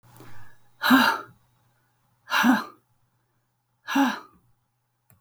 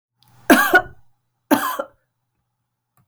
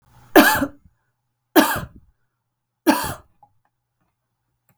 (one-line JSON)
{"exhalation_length": "5.2 s", "exhalation_amplitude": 16964, "exhalation_signal_mean_std_ratio": 0.37, "cough_length": "3.1 s", "cough_amplitude": 32768, "cough_signal_mean_std_ratio": 0.32, "three_cough_length": "4.8 s", "three_cough_amplitude": 32768, "three_cough_signal_mean_std_ratio": 0.29, "survey_phase": "alpha (2021-03-01 to 2021-08-12)", "age": "45-64", "gender": "Female", "wearing_mask": "No", "symptom_headache": true, "smoker_status": "Ex-smoker", "respiratory_condition_asthma": false, "respiratory_condition_other": false, "recruitment_source": "REACT", "submission_delay": "2 days", "covid_test_result": "Negative", "covid_test_method": "RT-qPCR"}